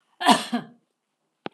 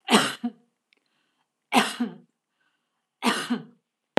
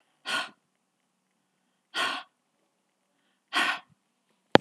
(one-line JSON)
{"cough_length": "1.5 s", "cough_amplitude": 25579, "cough_signal_mean_std_ratio": 0.32, "three_cough_length": "4.2 s", "three_cough_amplitude": 24164, "three_cough_signal_mean_std_ratio": 0.34, "exhalation_length": "4.6 s", "exhalation_amplitude": 32768, "exhalation_signal_mean_std_ratio": 0.22, "survey_phase": "alpha (2021-03-01 to 2021-08-12)", "age": "45-64", "gender": "Female", "wearing_mask": "No", "symptom_none": true, "smoker_status": "Never smoked", "respiratory_condition_asthma": false, "respiratory_condition_other": false, "recruitment_source": "REACT", "submission_delay": "1 day", "covid_test_result": "Negative", "covid_test_method": "RT-qPCR"}